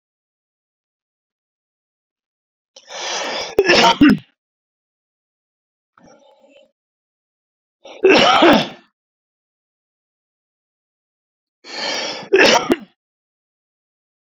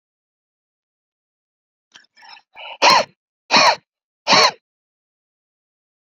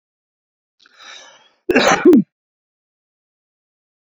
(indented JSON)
{
  "three_cough_length": "14.3 s",
  "three_cough_amplitude": 31451,
  "three_cough_signal_mean_std_ratio": 0.31,
  "exhalation_length": "6.1 s",
  "exhalation_amplitude": 31530,
  "exhalation_signal_mean_std_ratio": 0.28,
  "cough_length": "4.1 s",
  "cough_amplitude": 29380,
  "cough_signal_mean_std_ratio": 0.28,
  "survey_phase": "beta (2021-08-13 to 2022-03-07)",
  "age": "45-64",
  "gender": "Male",
  "wearing_mask": "No",
  "symptom_none": true,
  "smoker_status": "Ex-smoker",
  "respiratory_condition_asthma": false,
  "respiratory_condition_other": false,
  "recruitment_source": "REACT",
  "submission_delay": "10 days",
  "covid_test_result": "Negative",
  "covid_test_method": "RT-qPCR"
}